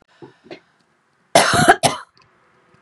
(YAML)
cough_length: 2.8 s
cough_amplitude: 32768
cough_signal_mean_std_ratio: 0.33
survey_phase: beta (2021-08-13 to 2022-03-07)
age: 45-64
gender: Female
wearing_mask: 'No'
symptom_none: true
smoker_status: Ex-smoker
respiratory_condition_asthma: false
respiratory_condition_other: false
recruitment_source: REACT
submission_delay: 1 day
covid_test_result: Negative
covid_test_method: RT-qPCR
influenza_a_test_result: Negative
influenza_b_test_result: Negative